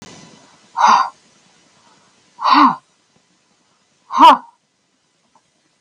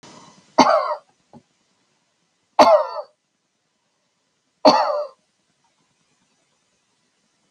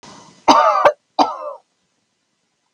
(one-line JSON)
{"exhalation_length": "5.8 s", "exhalation_amplitude": 32768, "exhalation_signal_mean_std_ratio": 0.31, "three_cough_length": "7.5 s", "three_cough_amplitude": 32768, "three_cough_signal_mean_std_ratio": 0.28, "cough_length": "2.7 s", "cough_amplitude": 32768, "cough_signal_mean_std_ratio": 0.39, "survey_phase": "beta (2021-08-13 to 2022-03-07)", "age": "65+", "gender": "Female", "wearing_mask": "No", "symptom_sore_throat": true, "symptom_onset": "6 days", "smoker_status": "Ex-smoker", "respiratory_condition_asthma": true, "respiratory_condition_other": false, "recruitment_source": "REACT", "submission_delay": "6 days", "covid_test_result": "Negative", "covid_test_method": "RT-qPCR"}